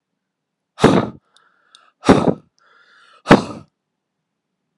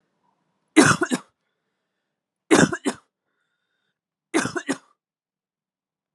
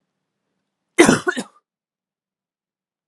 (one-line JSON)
{"exhalation_length": "4.8 s", "exhalation_amplitude": 32768, "exhalation_signal_mean_std_ratio": 0.27, "three_cough_length": "6.1 s", "three_cough_amplitude": 31280, "three_cough_signal_mean_std_ratio": 0.26, "cough_length": "3.1 s", "cough_amplitude": 32768, "cough_signal_mean_std_ratio": 0.23, "survey_phase": "beta (2021-08-13 to 2022-03-07)", "age": "18-44", "gender": "Male", "wearing_mask": "No", "symptom_none": true, "smoker_status": "Never smoked", "respiratory_condition_asthma": false, "respiratory_condition_other": false, "recruitment_source": "REACT", "submission_delay": "1 day", "covid_test_result": "Negative", "covid_test_method": "RT-qPCR", "influenza_a_test_result": "Negative", "influenza_b_test_result": "Negative"}